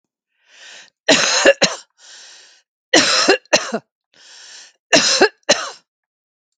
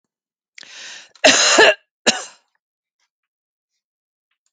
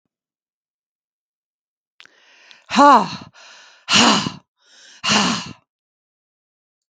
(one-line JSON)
{"three_cough_length": "6.6 s", "three_cough_amplitude": 32768, "three_cough_signal_mean_std_ratio": 0.4, "cough_length": "4.5 s", "cough_amplitude": 32768, "cough_signal_mean_std_ratio": 0.29, "exhalation_length": "6.9 s", "exhalation_amplitude": 32768, "exhalation_signal_mean_std_ratio": 0.31, "survey_phase": "beta (2021-08-13 to 2022-03-07)", "age": "65+", "gender": "Female", "wearing_mask": "No", "symptom_none": true, "smoker_status": "Ex-smoker", "respiratory_condition_asthma": false, "respiratory_condition_other": false, "recruitment_source": "REACT", "submission_delay": "2 days", "covid_test_result": "Negative", "covid_test_method": "RT-qPCR", "influenza_a_test_result": "Negative", "influenza_b_test_result": "Negative"}